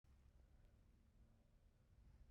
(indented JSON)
{
  "three_cough_length": "2.3 s",
  "three_cough_amplitude": 48,
  "three_cough_signal_mean_std_ratio": 1.13,
  "survey_phase": "beta (2021-08-13 to 2022-03-07)",
  "age": "45-64",
  "gender": "Female",
  "wearing_mask": "No",
  "symptom_cough_any": true,
  "symptom_runny_or_blocked_nose": true,
  "symptom_abdominal_pain": true,
  "symptom_fatigue": true,
  "symptom_fever_high_temperature": true,
  "symptom_headache": true,
  "symptom_change_to_sense_of_smell_or_taste": true,
  "symptom_loss_of_taste": true,
  "smoker_status": "Never smoked",
  "respiratory_condition_asthma": false,
  "respiratory_condition_other": false,
  "recruitment_source": "Test and Trace",
  "submission_delay": "1 day",
  "covid_test_result": "Positive",
  "covid_test_method": "RT-qPCR",
  "covid_ct_value": 19.2,
  "covid_ct_gene": "N gene"
}